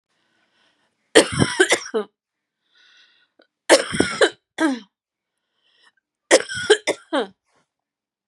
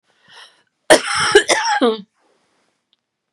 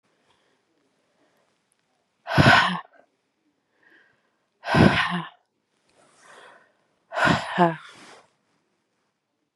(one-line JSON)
{"three_cough_length": "8.3 s", "three_cough_amplitude": 32768, "three_cough_signal_mean_std_ratio": 0.32, "cough_length": "3.3 s", "cough_amplitude": 32768, "cough_signal_mean_std_ratio": 0.4, "exhalation_length": "9.6 s", "exhalation_amplitude": 25530, "exhalation_signal_mean_std_ratio": 0.3, "survey_phase": "beta (2021-08-13 to 2022-03-07)", "age": "45-64", "gender": "Female", "wearing_mask": "No", "symptom_none": true, "smoker_status": "Never smoked", "respiratory_condition_asthma": false, "respiratory_condition_other": false, "recruitment_source": "REACT", "submission_delay": "1 day", "covid_test_method": "RT-qPCR", "influenza_a_test_result": "Unknown/Void", "influenza_b_test_result": "Unknown/Void"}